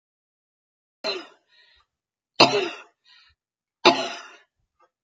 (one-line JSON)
{"three_cough_length": "5.0 s", "three_cough_amplitude": 31754, "three_cough_signal_mean_std_ratio": 0.24, "survey_phase": "beta (2021-08-13 to 2022-03-07)", "age": "65+", "gender": "Female", "wearing_mask": "No", "symptom_none": true, "smoker_status": "Ex-smoker", "respiratory_condition_asthma": true, "respiratory_condition_other": false, "recruitment_source": "REACT", "submission_delay": "2 days", "covid_test_result": "Negative", "covid_test_method": "RT-qPCR", "influenza_a_test_result": "Negative", "influenza_b_test_result": "Negative"}